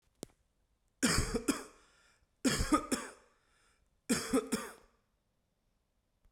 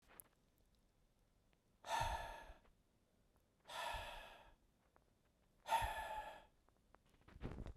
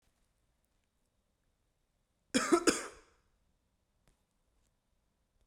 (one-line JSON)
{"three_cough_length": "6.3 s", "three_cough_amplitude": 5324, "three_cough_signal_mean_std_ratio": 0.38, "exhalation_length": "7.8 s", "exhalation_amplitude": 1616, "exhalation_signal_mean_std_ratio": 0.43, "cough_length": "5.5 s", "cough_amplitude": 8449, "cough_signal_mean_std_ratio": 0.2, "survey_phase": "beta (2021-08-13 to 2022-03-07)", "age": "18-44", "gender": "Male", "wearing_mask": "No", "symptom_cough_any": true, "symptom_sore_throat": true, "symptom_onset": "8 days", "smoker_status": "Never smoked", "respiratory_condition_asthma": false, "respiratory_condition_other": false, "recruitment_source": "Test and Trace", "submission_delay": "3 days"}